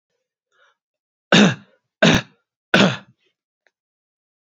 {"three_cough_length": "4.4 s", "three_cough_amplitude": 31821, "three_cough_signal_mean_std_ratio": 0.29, "survey_phase": "beta (2021-08-13 to 2022-03-07)", "age": "18-44", "gender": "Male", "wearing_mask": "No", "symptom_fatigue": true, "symptom_onset": "2 days", "smoker_status": "Never smoked", "respiratory_condition_asthma": false, "respiratory_condition_other": false, "recruitment_source": "Test and Trace", "submission_delay": "1 day", "covid_test_result": "Positive", "covid_test_method": "ePCR"}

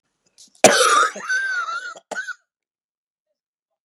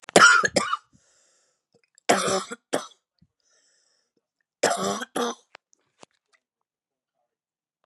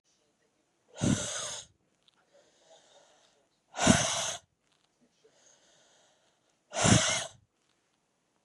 {"cough_length": "3.8 s", "cough_amplitude": 32768, "cough_signal_mean_std_ratio": 0.41, "three_cough_length": "7.9 s", "three_cough_amplitude": 32611, "three_cough_signal_mean_std_ratio": 0.29, "exhalation_length": "8.4 s", "exhalation_amplitude": 16982, "exhalation_signal_mean_std_ratio": 0.31, "survey_phase": "beta (2021-08-13 to 2022-03-07)", "age": "18-44", "gender": "Female", "wearing_mask": "No", "symptom_cough_any": true, "symptom_runny_or_blocked_nose": true, "symptom_sore_throat": true, "symptom_diarrhoea": true, "symptom_fatigue": true, "symptom_fever_high_temperature": true, "symptom_headache": true, "symptom_onset": "3 days", "smoker_status": "Ex-smoker", "respiratory_condition_asthma": true, "respiratory_condition_other": false, "recruitment_source": "Test and Trace", "submission_delay": "1 day", "covid_test_result": "Positive", "covid_test_method": "RT-qPCR", "covid_ct_value": 17.9, "covid_ct_gene": "ORF1ab gene"}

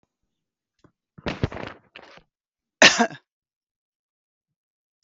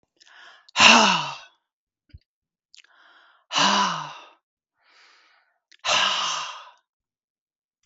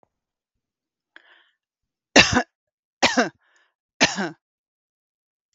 {"cough_length": "5.0 s", "cough_amplitude": 32768, "cough_signal_mean_std_ratio": 0.19, "exhalation_length": "7.9 s", "exhalation_amplitude": 32768, "exhalation_signal_mean_std_ratio": 0.34, "three_cough_length": "5.5 s", "three_cough_amplitude": 32768, "three_cough_signal_mean_std_ratio": 0.24, "survey_phase": "beta (2021-08-13 to 2022-03-07)", "age": "45-64", "gender": "Female", "wearing_mask": "No", "symptom_none": true, "smoker_status": "Never smoked", "respiratory_condition_asthma": false, "respiratory_condition_other": false, "recruitment_source": "REACT", "submission_delay": "1 day", "covid_test_result": "Negative", "covid_test_method": "RT-qPCR"}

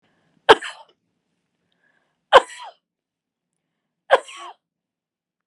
{"three_cough_length": "5.5 s", "three_cough_amplitude": 32768, "three_cough_signal_mean_std_ratio": 0.16, "survey_phase": "beta (2021-08-13 to 2022-03-07)", "age": "45-64", "gender": "Female", "wearing_mask": "Yes", "symptom_none": true, "smoker_status": "Never smoked", "respiratory_condition_asthma": true, "respiratory_condition_other": false, "recruitment_source": "REACT", "submission_delay": "4 days", "covid_test_result": "Negative", "covid_test_method": "RT-qPCR", "influenza_a_test_result": "Negative", "influenza_b_test_result": "Negative"}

